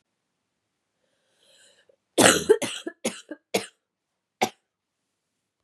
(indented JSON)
{
  "cough_length": "5.6 s",
  "cough_amplitude": 32767,
  "cough_signal_mean_std_ratio": 0.24,
  "survey_phase": "beta (2021-08-13 to 2022-03-07)",
  "age": "18-44",
  "gender": "Female",
  "wearing_mask": "No",
  "symptom_cough_any": true,
  "symptom_runny_or_blocked_nose": true,
  "symptom_fatigue": true,
  "symptom_other": true,
  "symptom_onset": "3 days",
  "smoker_status": "Ex-smoker",
  "respiratory_condition_asthma": true,
  "respiratory_condition_other": false,
  "recruitment_source": "Test and Trace",
  "submission_delay": "1 day",
  "covid_test_result": "Positive",
  "covid_test_method": "RT-qPCR",
  "covid_ct_value": 20.6,
  "covid_ct_gene": "N gene"
}